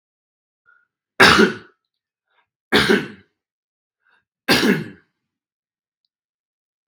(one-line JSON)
{"three_cough_length": "6.9 s", "three_cough_amplitude": 32768, "three_cough_signal_mean_std_ratio": 0.29, "survey_phase": "beta (2021-08-13 to 2022-03-07)", "age": "18-44", "gender": "Male", "wearing_mask": "No", "symptom_none": true, "smoker_status": "Never smoked", "respiratory_condition_asthma": false, "respiratory_condition_other": false, "recruitment_source": "REACT", "submission_delay": "1 day", "covid_test_result": "Negative", "covid_test_method": "RT-qPCR"}